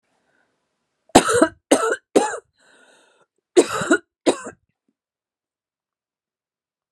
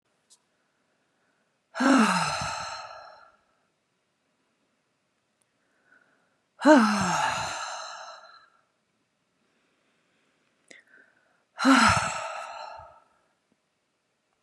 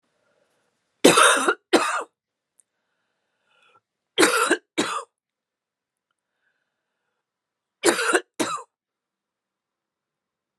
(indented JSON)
{
  "cough_length": "6.9 s",
  "cough_amplitude": 32768,
  "cough_signal_mean_std_ratio": 0.29,
  "exhalation_length": "14.4 s",
  "exhalation_amplitude": 17786,
  "exhalation_signal_mean_std_ratio": 0.33,
  "three_cough_length": "10.6 s",
  "three_cough_amplitude": 32767,
  "three_cough_signal_mean_std_ratio": 0.3,
  "survey_phase": "beta (2021-08-13 to 2022-03-07)",
  "age": "45-64",
  "gender": "Female",
  "wearing_mask": "No",
  "symptom_none": true,
  "smoker_status": "Prefer not to say",
  "respiratory_condition_asthma": false,
  "respiratory_condition_other": false,
  "recruitment_source": "REACT",
  "submission_delay": "2 days",
  "covid_test_result": "Negative",
  "covid_test_method": "RT-qPCR"
}